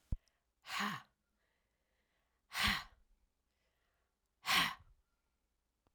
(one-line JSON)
{"exhalation_length": "5.9 s", "exhalation_amplitude": 3977, "exhalation_signal_mean_std_ratio": 0.3, "survey_phase": "alpha (2021-03-01 to 2021-08-12)", "age": "65+", "gender": "Female", "wearing_mask": "No", "symptom_headache": true, "symptom_change_to_sense_of_smell_or_taste": true, "symptom_loss_of_taste": true, "symptom_onset": "5 days", "smoker_status": "Never smoked", "respiratory_condition_asthma": false, "respiratory_condition_other": false, "recruitment_source": "Test and Trace", "submission_delay": "2 days", "covid_test_result": "Positive", "covid_test_method": "RT-qPCR"}